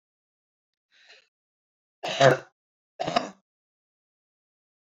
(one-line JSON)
{"cough_length": "4.9 s", "cough_amplitude": 22139, "cough_signal_mean_std_ratio": 0.21, "survey_phase": "beta (2021-08-13 to 2022-03-07)", "age": "18-44", "gender": "Female", "wearing_mask": "No", "symptom_abdominal_pain": true, "symptom_fatigue": true, "smoker_status": "Never smoked", "respiratory_condition_asthma": false, "respiratory_condition_other": false, "recruitment_source": "REACT", "submission_delay": "2 days", "covid_test_result": "Negative", "covid_test_method": "RT-qPCR"}